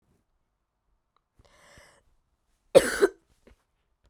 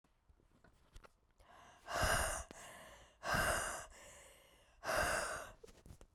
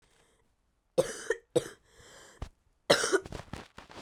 {"cough_length": "4.1 s", "cough_amplitude": 22913, "cough_signal_mean_std_ratio": 0.17, "exhalation_length": "6.1 s", "exhalation_amplitude": 2689, "exhalation_signal_mean_std_ratio": 0.5, "three_cough_length": "4.0 s", "three_cough_amplitude": 15568, "three_cough_signal_mean_std_ratio": 0.31, "survey_phase": "beta (2021-08-13 to 2022-03-07)", "age": "18-44", "gender": "Female", "wearing_mask": "No", "symptom_cough_any": true, "symptom_new_continuous_cough": true, "symptom_runny_or_blocked_nose": true, "symptom_shortness_of_breath": true, "symptom_sore_throat": true, "symptom_fatigue": true, "symptom_fever_high_temperature": true, "symptom_headache": true, "symptom_onset": "6 days", "smoker_status": "Never smoked", "respiratory_condition_asthma": false, "respiratory_condition_other": false, "recruitment_source": "Test and Trace", "submission_delay": "1 day", "covid_test_result": "Positive", "covid_test_method": "RT-qPCR", "covid_ct_value": 15.8, "covid_ct_gene": "N gene"}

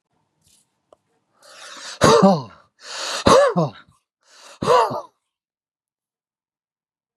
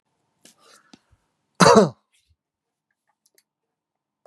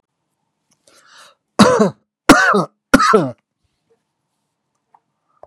{"exhalation_length": "7.2 s", "exhalation_amplitude": 32767, "exhalation_signal_mean_std_ratio": 0.35, "cough_length": "4.3 s", "cough_amplitude": 32768, "cough_signal_mean_std_ratio": 0.2, "three_cough_length": "5.5 s", "three_cough_amplitude": 32768, "three_cough_signal_mean_std_ratio": 0.34, "survey_phase": "beta (2021-08-13 to 2022-03-07)", "age": "45-64", "gender": "Male", "wearing_mask": "No", "symptom_none": true, "smoker_status": "Never smoked", "respiratory_condition_asthma": false, "respiratory_condition_other": false, "recruitment_source": "REACT", "submission_delay": "1 day", "covid_test_result": "Negative", "covid_test_method": "RT-qPCR", "influenza_a_test_result": "Negative", "influenza_b_test_result": "Negative"}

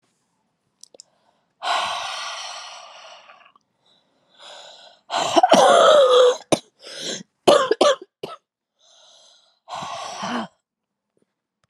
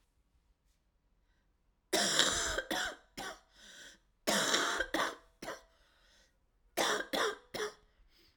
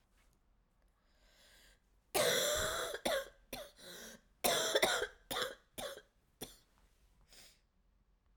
{"exhalation_length": "11.7 s", "exhalation_amplitude": 32598, "exhalation_signal_mean_std_ratio": 0.38, "three_cough_length": "8.4 s", "three_cough_amplitude": 11871, "three_cough_signal_mean_std_ratio": 0.47, "cough_length": "8.4 s", "cough_amplitude": 5770, "cough_signal_mean_std_ratio": 0.43, "survey_phase": "alpha (2021-03-01 to 2021-08-12)", "age": "18-44", "gender": "Female", "wearing_mask": "No", "symptom_cough_any": true, "symptom_new_continuous_cough": true, "symptom_diarrhoea": true, "symptom_fatigue": true, "symptom_fever_high_temperature": true, "symptom_headache": true, "symptom_change_to_sense_of_smell_or_taste": true, "symptom_onset": "3 days", "smoker_status": "Never smoked", "respiratory_condition_asthma": false, "respiratory_condition_other": false, "recruitment_source": "Test and Trace", "submission_delay": "2 days", "covid_test_result": "Positive", "covid_test_method": "RT-qPCR", "covid_ct_value": 13.0, "covid_ct_gene": "N gene", "covid_ct_mean": 13.4, "covid_viral_load": "40000000 copies/ml", "covid_viral_load_category": "High viral load (>1M copies/ml)"}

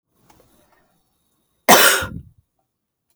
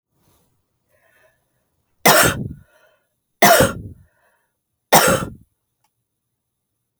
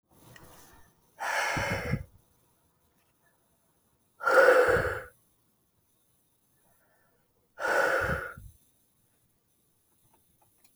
{"cough_length": "3.2 s", "cough_amplitude": 32768, "cough_signal_mean_std_ratio": 0.27, "three_cough_length": "7.0 s", "three_cough_amplitude": 32768, "three_cough_signal_mean_std_ratio": 0.3, "exhalation_length": "10.8 s", "exhalation_amplitude": 13622, "exhalation_signal_mean_std_ratio": 0.35, "survey_phase": "beta (2021-08-13 to 2022-03-07)", "age": "45-64", "gender": "Female", "wearing_mask": "No", "symptom_cough_any": true, "symptom_fatigue": true, "symptom_change_to_sense_of_smell_or_taste": true, "symptom_loss_of_taste": true, "symptom_onset": "5 days", "smoker_status": "Never smoked", "respiratory_condition_asthma": false, "respiratory_condition_other": false, "recruitment_source": "Test and Trace", "submission_delay": "1 day", "covid_test_result": "Positive", "covid_test_method": "ePCR"}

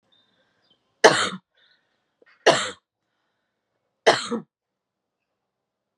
{"three_cough_length": "6.0 s", "three_cough_amplitude": 32760, "three_cough_signal_mean_std_ratio": 0.23, "survey_phase": "beta (2021-08-13 to 2022-03-07)", "age": "18-44", "gender": "Female", "wearing_mask": "No", "symptom_cough_any": true, "symptom_fatigue": true, "symptom_onset": "4 days", "smoker_status": "Never smoked", "respiratory_condition_asthma": false, "respiratory_condition_other": false, "recruitment_source": "Test and Trace", "submission_delay": "2 days", "covid_test_result": "Positive", "covid_test_method": "RT-qPCR", "covid_ct_value": 18.5, "covid_ct_gene": "ORF1ab gene", "covid_ct_mean": 19.1, "covid_viral_load": "540000 copies/ml", "covid_viral_load_category": "Low viral load (10K-1M copies/ml)"}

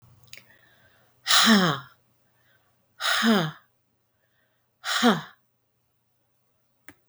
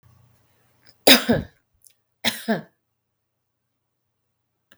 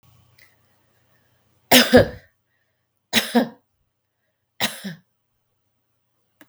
{"exhalation_length": "7.1 s", "exhalation_amplitude": 18494, "exhalation_signal_mean_std_ratio": 0.35, "cough_length": "4.8 s", "cough_amplitude": 32768, "cough_signal_mean_std_ratio": 0.22, "three_cough_length": "6.5 s", "three_cough_amplitude": 32768, "three_cough_signal_mean_std_ratio": 0.24, "survey_phase": "beta (2021-08-13 to 2022-03-07)", "age": "65+", "gender": "Female", "wearing_mask": "No", "symptom_cough_any": true, "symptom_runny_or_blocked_nose": true, "symptom_sore_throat": true, "smoker_status": "Ex-smoker", "respiratory_condition_asthma": false, "respiratory_condition_other": false, "recruitment_source": "REACT", "submission_delay": "9 days", "covid_test_result": "Negative", "covid_test_method": "RT-qPCR", "influenza_a_test_result": "Negative", "influenza_b_test_result": "Negative"}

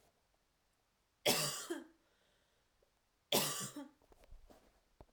{"cough_length": "5.1 s", "cough_amplitude": 4384, "cough_signal_mean_std_ratio": 0.33, "survey_phase": "alpha (2021-03-01 to 2021-08-12)", "age": "18-44", "gender": "Female", "wearing_mask": "No", "symptom_none": true, "smoker_status": "Never smoked", "respiratory_condition_asthma": false, "respiratory_condition_other": false, "recruitment_source": "REACT", "submission_delay": "1 day", "covid_test_result": "Negative", "covid_test_method": "RT-qPCR"}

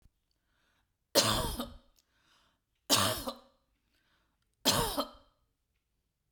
{"three_cough_length": "6.3 s", "three_cough_amplitude": 9821, "three_cough_signal_mean_std_ratio": 0.34, "survey_phase": "beta (2021-08-13 to 2022-03-07)", "age": "45-64", "gender": "Female", "wearing_mask": "No", "symptom_runny_or_blocked_nose": true, "symptom_onset": "5 days", "smoker_status": "Never smoked", "respiratory_condition_asthma": false, "respiratory_condition_other": false, "recruitment_source": "REACT", "submission_delay": "3 days", "covid_test_result": "Negative", "covid_test_method": "RT-qPCR", "influenza_a_test_result": "Negative", "influenza_b_test_result": "Negative"}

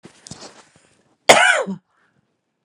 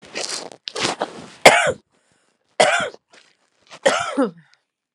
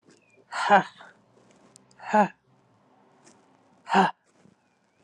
{"cough_length": "2.6 s", "cough_amplitude": 32768, "cough_signal_mean_std_ratio": 0.3, "three_cough_length": "4.9 s", "three_cough_amplitude": 32768, "three_cough_signal_mean_std_ratio": 0.37, "exhalation_length": "5.0 s", "exhalation_amplitude": 19555, "exhalation_signal_mean_std_ratio": 0.28, "survey_phase": "alpha (2021-03-01 to 2021-08-12)", "age": "45-64", "gender": "Female", "wearing_mask": "No", "symptom_none": true, "smoker_status": "Ex-smoker", "respiratory_condition_asthma": true, "respiratory_condition_other": false, "recruitment_source": "REACT", "submission_delay": "2 days", "covid_test_result": "Negative", "covid_test_method": "RT-qPCR"}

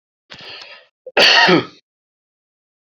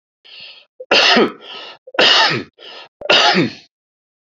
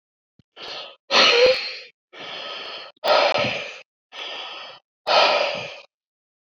{"cough_length": "3.0 s", "cough_amplitude": 30858, "cough_signal_mean_std_ratio": 0.35, "three_cough_length": "4.4 s", "three_cough_amplitude": 32767, "three_cough_signal_mean_std_ratio": 0.49, "exhalation_length": "6.6 s", "exhalation_amplitude": 28555, "exhalation_signal_mean_std_ratio": 0.48, "survey_phase": "beta (2021-08-13 to 2022-03-07)", "age": "65+", "gender": "Male", "wearing_mask": "No", "symptom_none": true, "smoker_status": "Never smoked", "respiratory_condition_asthma": false, "respiratory_condition_other": false, "recruitment_source": "REACT", "submission_delay": "2 days", "covid_test_result": "Negative", "covid_test_method": "RT-qPCR", "influenza_a_test_result": "Unknown/Void", "influenza_b_test_result": "Unknown/Void"}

